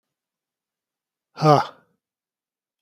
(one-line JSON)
{"exhalation_length": "2.8 s", "exhalation_amplitude": 28797, "exhalation_signal_mean_std_ratio": 0.22, "survey_phase": "beta (2021-08-13 to 2022-03-07)", "age": "45-64", "gender": "Male", "wearing_mask": "No", "symptom_none": true, "smoker_status": "Current smoker (11 or more cigarettes per day)", "respiratory_condition_asthma": false, "respiratory_condition_other": false, "recruitment_source": "REACT", "submission_delay": "1 day", "covid_test_result": "Negative", "covid_test_method": "RT-qPCR", "influenza_a_test_result": "Negative", "influenza_b_test_result": "Negative"}